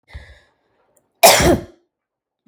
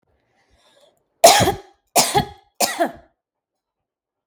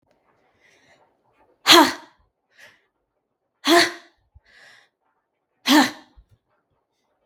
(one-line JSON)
{"cough_length": "2.5 s", "cough_amplitude": 32768, "cough_signal_mean_std_ratio": 0.31, "three_cough_length": "4.3 s", "three_cough_amplitude": 32766, "three_cough_signal_mean_std_ratio": 0.31, "exhalation_length": "7.3 s", "exhalation_amplitude": 32768, "exhalation_signal_mean_std_ratio": 0.25, "survey_phase": "beta (2021-08-13 to 2022-03-07)", "age": "18-44", "gender": "Female", "wearing_mask": "No", "symptom_runny_or_blocked_nose": true, "symptom_sore_throat": true, "symptom_headache": true, "symptom_onset": "12 days", "smoker_status": "Ex-smoker", "respiratory_condition_asthma": true, "respiratory_condition_other": false, "recruitment_source": "REACT", "submission_delay": "2 days", "covid_test_result": "Negative", "covid_test_method": "RT-qPCR", "influenza_a_test_result": "Unknown/Void", "influenza_b_test_result": "Unknown/Void"}